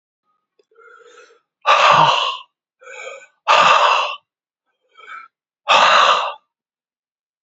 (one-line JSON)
{"exhalation_length": "7.4 s", "exhalation_amplitude": 30765, "exhalation_signal_mean_std_ratio": 0.44, "survey_phase": "beta (2021-08-13 to 2022-03-07)", "age": "18-44", "gender": "Male", "wearing_mask": "No", "symptom_runny_or_blocked_nose": true, "symptom_fatigue": true, "symptom_loss_of_taste": true, "symptom_onset": "4 days", "smoker_status": "Never smoked", "respiratory_condition_asthma": false, "respiratory_condition_other": false, "recruitment_source": "Test and Trace", "submission_delay": "2 days", "covid_test_result": "Positive", "covid_test_method": "RT-qPCR", "covid_ct_value": 18.1, "covid_ct_gene": "ORF1ab gene", "covid_ct_mean": 18.9, "covid_viral_load": "640000 copies/ml", "covid_viral_load_category": "Low viral load (10K-1M copies/ml)"}